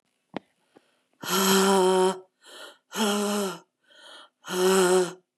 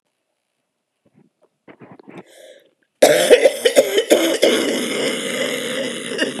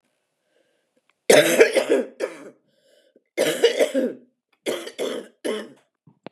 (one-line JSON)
{"exhalation_length": "5.4 s", "exhalation_amplitude": 12954, "exhalation_signal_mean_std_ratio": 0.56, "cough_length": "6.4 s", "cough_amplitude": 32768, "cough_signal_mean_std_ratio": 0.51, "three_cough_length": "6.3 s", "three_cough_amplitude": 32016, "three_cough_signal_mean_std_ratio": 0.4, "survey_phase": "beta (2021-08-13 to 2022-03-07)", "age": "18-44", "gender": "Female", "wearing_mask": "No", "symptom_cough_any": true, "symptom_new_continuous_cough": true, "symptom_runny_or_blocked_nose": true, "symptom_abdominal_pain": true, "symptom_fatigue": true, "symptom_fever_high_temperature": true, "symptom_headache": true, "symptom_other": true, "symptom_onset": "5 days", "smoker_status": "Ex-smoker", "respiratory_condition_asthma": false, "respiratory_condition_other": false, "recruitment_source": "Test and Trace", "submission_delay": "2 days", "covid_test_result": "Positive", "covid_test_method": "RT-qPCR", "covid_ct_value": 14.0, "covid_ct_gene": "ORF1ab gene", "covid_ct_mean": 14.3, "covid_viral_load": "21000000 copies/ml", "covid_viral_load_category": "High viral load (>1M copies/ml)"}